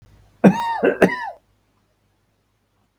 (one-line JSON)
{"cough_length": "3.0 s", "cough_amplitude": 32768, "cough_signal_mean_std_ratio": 0.34, "survey_phase": "beta (2021-08-13 to 2022-03-07)", "age": "65+", "gender": "Male", "wearing_mask": "No", "symptom_none": true, "smoker_status": "Ex-smoker", "respiratory_condition_asthma": false, "respiratory_condition_other": true, "recruitment_source": "REACT", "submission_delay": "20 days", "covid_test_result": "Negative", "covid_test_method": "RT-qPCR", "influenza_a_test_result": "Unknown/Void", "influenza_b_test_result": "Unknown/Void"}